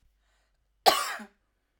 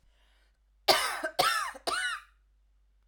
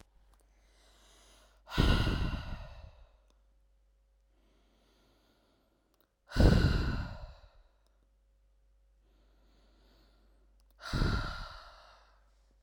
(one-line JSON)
{"cough_length": "1.8 s", "cough_amplitude": 18510, "cough_signal_mean_std_ratio": 0.26, "three_cough_length": "3.1 s", "three_cough_amplitude": 13460, "three_cough_signal_mean_std_ratio": 0.45, "exhalation_length": "12.6 s", "exhalation_amplitude": 14284, "exhalation_signal_mean_std_ratio": 0.32, "survey_phase": "alpha (2021-03-01 to 2021-08-12)", "age": "18-44", "gender": "Female", "wearing_mask": "No", "symptom_none": true, "smoker_status": "Never smoked", "respiratory_condition_asthma": true, "respiratory_condition_other": false, "recruitment_source": "REACT", "submission_delay": "2 days", "covid_test_result": "Negative", "covid_test_method": "RT-qPCR"}